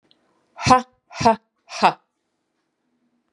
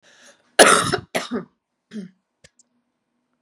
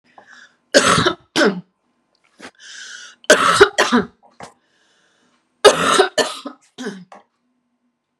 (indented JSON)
{
  "exhalation_length": "3.3 s",
  "exhalation_amplitude": 32553,
  "exhalation_signal_mean_std_ratio": 0.27,
  "cough_length": "3.4 s",
  "cough_amplitude": 32768,
  "cough_signal_mean_std_ratio": 0.28,
  "three_cough_length": "8.2 s",
  "three_cough_amplitude": 32768,
  "three_cough_signal_mean_std_ratio": 0.37,
  "survey_phase": "beta (2021-08-13 to 2022-03-07)",
  "age": "45-64",
  "gender": "Female",
  "wearing_mask": "No",
  "symptom_cough_any": true,
  "symptom_runny_or_blocked_nose": true,
  "symptom_change_to_sense_of_smell_or_taste": true,
  "symptom_onset": "5 days",
  "smoker_status": "Never smoked",
  "respiratory_condition_asthma": false,
  "respiratory_condition_other": false,
  "recruitment_source": "REACT",
  "submission_delay": "2 days",
  "covid_test_result": "Positive",
  "covid_test_method": "RT-qPCR",
  "covid_ct_value": 21.0,
  "covid_ct_gene": "E gene",
  "influenza_a_test_result": "Negative",
  "influenza_b_test_result": "Negative"
}